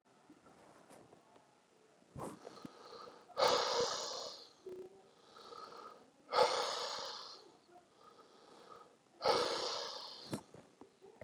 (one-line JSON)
{"exhalation_length": "11.2 s", "exhalation_amplitude": 4410, "exhalation_signal_mean_std_ratio": 0.43, "survey_phase": "beta (2021-08-13 to 2022-03-07)", "age": "65+", "gender": "Male", "wearing_mask": "No", "symptom_cough_any": true, "symptom_new_continuous_cough": true, "symptom_runny_or_blocked_nose": true, "symptom_shortness_of_breath": true, "symptom_sore_throat": true, "symptom_abdominal_pain": true, "symptom_fatigue": true, "symptom_headache": true, "symptom_change_to_sense_of_smell_or_taste": true, "symptom_loss_of_taste": true, "symptom_onset": "3 days", "smoker_status": "Ex-smoker", "respiratory_condition_asthma": false, "respiratory_condition_other": true, "recruitment_source": "Test and Trace", "submission_delay": "2 days", "covid_test_result": "Positive", "covid_test_method": "ePCR"}